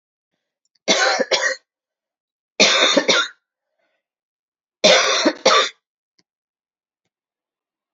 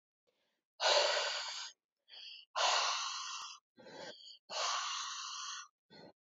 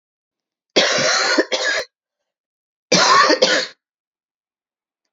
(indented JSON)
{
  "three_cough_length": "7.9 s",
  "three_cough_amplitude": 32767,
  "three_cough_signal_mean_std_ratio": 0.39,
  "exhalation_length": "6.3 s",
  "exhalation_amplitude": 5085,
  "exhalation_signal_mean_std_ratio": 0.56,
  "cough_length": "5.1 s",
  "cough_amplitude": 32767,
  "cough_signal_mean_std_ratio": 0.47,
  "survey_phase": "alpha (2021-03-01 to 2021-08-12)",
  "age": "45-64",
  "gender": "Female",
  "wearing_mask": "No",
  "symptom_cough_any": true,
  "symptom_new_continuous_cough": true,
  "symptom_fatigue": true,
  "symptom_fever_high_temperature": true,
  "symptom_headache": true,
  "symptom_change_to_sense_of_smell_or_taste": true,
  "symptom_loss_of_taste": true,
  "symptom_onset": "2 days",
  "smoker_status": "Ex-smoker",
  "respiratory_condition_asthma": false,
  "respiratory_condition_other": false,
  "recruitment_source": "Test and Trace",
  "submission_delay": "2 days",
  "covid_test_result": "Positive",
  "covid_test_method": "RT-qPCR",
  "covid_ct_value": 16.4,
  "covid_ct_gene": "ORF1ab gene",
  "covid_ct_mean": 17.4,
  "covid_viral_load": "2000000 copies/ml",
  "covid_viral_load_category": "High viral load (>1M copies/ml)"
}